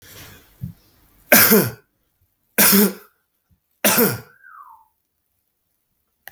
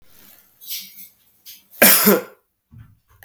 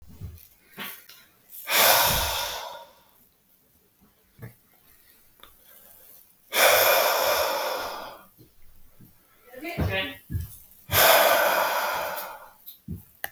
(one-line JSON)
{"three_cough_length": "6.3 s", "three_cough_amplitude": 32768, "three_cough_signal_mean_std_ratio": 0.33, "cough_length": "3.2 s", "cough_amplitude": 32768, "cough_signal_mean_std_ratio": 0.31, "exhalation_length": "13.3 s", "exhalation_amplitude": 20505, "exhalation_signal_mean_std_ratio": 0.48, "survey_phase": "beta (2021-08-13 to 2022-03-07)", "age": "18-44", "gender": "Male", "wearing_mask": "No", "symptom_none": true, "smoker_status": "Never smoked", "respiratory_condition_asthma": false, "respiratory_condition_other": false, "recruitment_source": "REACT", "submission_delay": "2 days", "covid_test_result": "Negative", "covid_test_method": "RT-qPCR", "influenza_a_test_result": "Negative", "influenza_b_test_result": "Negative"}